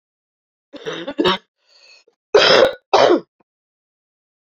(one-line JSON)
{"cough_length": "4.5 s", "cough_amplitude": 32767, "cough_signal_mean_std_ratio": 0.36, "survey_phase": "beta (2021-08-13 to 2022-03-07)", "age": "45-64", "gender": "Female", "wearing_mask": "No", "symptom_cough_any": true, "symptom_runny_or_blocked_nose": true, "symptom_sore_throat": true, "symptom_abdominal_pain": true, "symptom_headache": true, "symptom_change_to_sense_of_smell_or_taste": true, "symptom_loss_of_taste": true, "symptom_onset": "3 days", "smoker_status": "Never smoked", "respiratory_condition_asthma": false, "respiratory_condition_other": false, "recruitment_source": "Test and Trace", "submission_delay": "2 days", "covid_test_result": "Positive", "covid_test_method": "RT-qPCR", "covid_ct_value": 16.9, "covid_ct_gene": "N gene", "covid_ct_mean": 17.8, "covid_viral_load": "1400000 copies/ml", "covid_viral_load_category": "High viral load (>1M copies/ml)"}